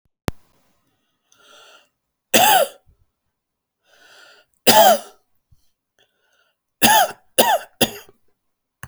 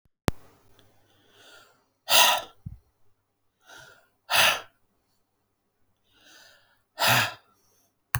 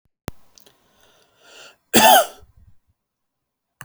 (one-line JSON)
{"three_cough_length": "8.9 s", "three_cough_amplitude": 32768, "three_cough_signal_mean_std_ratio": 0.3, "exhalation_length": "8.2 s", "exhalation_amplitude": 24572, "exhalation_signal_mean_std_ratio": 0.28, "cough_length": "3.8 s", "cough_amplitude": 32767, "cough_signal_mean_std_ratio": 0.25, "survey_phase": "beta (2021-08-13 to 2022-03-07)", "age": "18-44", "gender": "Male", "wearing_mask": "No", "symptom_none": true, "smoker_status": "Never smoked", "respiratory_condition_asthma": false, "respiratory_condition_other": false, "recruitment_source": "REACT", "submission_delay": "3 days", "covid_test_result": "Negative", "covid_test_method": "RT-qPCR"}